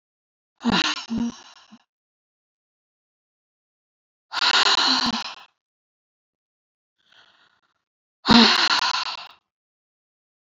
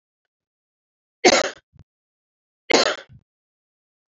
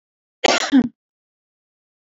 exhalation_length: 10.4 s
exhalation_amplitude: 26805
exhalation_signal_mean_std_ratio: 0.34
three_cough_length: 4.1 s
three_cough_amplitude: 29415
three_cough_signal_mean_std_ratio: 0.24
cough_length: 2.1 s
cough_amplitude: 26667
cough_signal_mean_std_ratio: 0.31
survey_phase: beta (2021-08-13 to 2022-03-07)
age: 65+
gender: Female
wearing_mask: 'No'
symptom_none: true
smoker_status: Ex-smoker
respiratory_condition_asthma: false
respiratory_condition_other: false
recruitment_source: REACT
submission_delay: 1 day
covid_test_result: Negative
covid_test_method: RT-qPCR
influenza_a_test_result: Negative
influenza_b_test_result: Negative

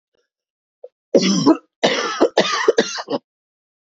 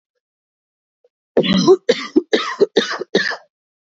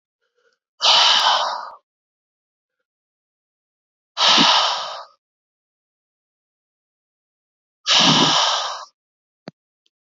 three_cough_length: 3.9 s
three_cough_amplitude: 28172
three_cough_signal_mean_std_ratio: 0.45
cough_length: 3.9 s
cough_amplitude: 26857
cough_signal_mean_std_ratio: 0.41
exhalation_length: 10.2 s
exhalation_amplitude: 28365
exhalation_signal_mean_std_ratio: 0.39
survey_phase: beta (2021-08-13 to 2022-03-07)
age: 18-44
gender: Female
wearing_mask: 'No'
symptom_cough_any: true
symptom_runny_or_blocked_nose: true
symptom_shortness_of_breath: true
symptom_fatigue: true
symptom_onset: 15 days
smoker_status: Never smoked
respiratory_condition_asthma: false
respiratory_condition_other: false
recruitment_source: Test and Trace
submission_delay: 1 day
covid_test_result: Positive
covid_test_method: RT-qPCR
covid_ct_value: 13.8
covid_ct_gene: N gene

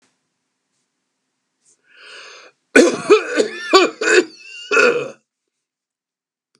cough_length: 6.6 s
cough_amplitude: 32768
cough_signal_mean_std_ratio: 0.36
survey_phase: beta (2021-08-13 to 2022-03-07)
age: 65+
gender: Male
wearing_mask: 'No'
symptom_other: true
symptom_onset: 12 days
smoker_status: Ex-smoker
respiratory_condition_asthma: false
respiratory_condition_other: false
recruitment_source: REACT
submission_delay: 0 days
covid_test_result: Negative
covid_test_method: RT-qPCR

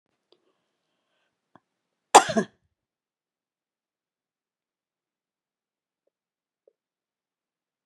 cough_length: 7.9 s
cough_amplitude: 32767
cough_signal_mean_std_ratio: 0.1
survey_phase: beta (2021-08-13 to 2022-03-07)
age: 65+
gender: Female
wearing_mask: 'No'
symptom_none: true
symptom_onset: 6 days
smoker_status: Ex-smoker
respiratory_condition_asthma: false
respiratory_condition_other: false
recruitment_source: REACT
submission_delay: 1 day
covid_test_result: Negative
covid_test_method: RT-qPCR
influenza_a_test_result: Negative
influenza_b_test_result: Negative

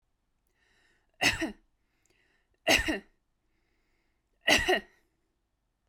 three_cough_length: 5.9 s
three_cough_amplitude: 11006
three_cough_signal_mean_std_ratio: 0.29
survey_phase: beta (2021-08-13 to 2022-03-07)
age: 18-44
gender: Female
wearing_mask: 'No'
symptom_none: true
symptom_onset: 11 days
smoker_status: Current smoker (1 to 10 cigarettes per day)
respiratory_condition_asthma: false
respiratory_condition_other: false
recruitment_source: REACT
submission_delay: 3 days
covid_test_result: Negative
covid_test_method: RT-qPCR
influenza_a_test_result: Unknown/Void
influenza_b_test_result: Unknown/Void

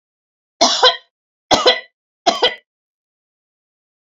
three_cough_length: 4.2 s
three_cough_amplitude: 30149
three_cough_signal_mean_std_ratio: 0.33
survey_phase: alpha (2021-03-01 to 2021-08-12)
age: 45-64
gender: Female
wearing_mask: 'No'
symptom_none: true
smoker_status: Ex-smoker
respiratory_condition_asthma: false
respiratory_condition_other: false
recruitment_source: REACT
submission_delay: 1 day
covid_test_result: Negative
covid_test_method: RT-qPCR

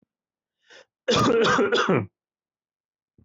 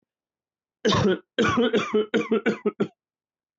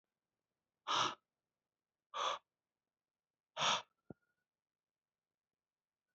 cough_length: 3.2 s
cough_amplitude: 11081
cough_signal_mean_std_ratio: 0.48
three_cough_length: 3.6 s
three_cough_amplitude: 12243
three_cough_signal_mean_std_ratio: 0.54
exhalation_length: 6.1 s
exhalation_amplitude: 2752
exhalation_signal_mean_std_ratio: 0.27
survey_phase: beta (2021-08-13 to 2022-03-07)
age: 18-44
gender: Male
wearing_mask: 'No'
symptom_none: true
smoker_status: Never smoked
respiratory_condition_asthma: false
respiratory_condition_other: false
recruitment_source: REACT
submission_delay: 4 days
covid_test_result: Negative
covid_test_method: RT-qPCR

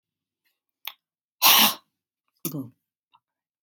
cough_length: 3.6 s
cough_amplitude: 23535
cough_signal_mean_std_ratio: 0.26
survey_phase: beta (2021-08-13 to 2022-03-07)
age: 65+
gender: Female
wearing_mask: 'No'
symptom_none: true
smoker_status: Prefer not to say
respiratory_condition_asthma: false
respiratory_condition_other: false
recruitment_source: REACT
submission_delay: 3 days
covid_test_result: Negative
covid_test_method: RT-qPCR
influenza_a_test_result: Negative
influenza_b_test_result: Negative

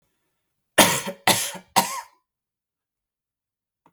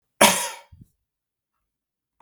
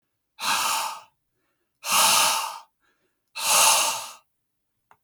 three_cough_length: 3.9 s
three_cough_amplitude: 32768
three_cough_signal_mean_std_ratio: 0.29
cough_length: 2.2 s
cough_amplitude: 32768
cough_signal_mean_std_ratio: 0.24
exhalation_length: 5.0 s
exhalation_amplitude: 20412
exhalation_signal_mean_std_ratio: 0.49
survey_phase: beta (2021-08-13 to 2022-03-07)
age: 18-44
gender: Male
wearing_mask: 'No'
symptom_sore_throat: true
symptom_fatigue: true
smoker_status: Never smoked
respiratory_condition_asthma: false
respiratory_condition_other: false
recruitment_source: Test and Trace
submission_delay: 1 day
covid_test_result: Positive
covid_test_method: RT-qPCR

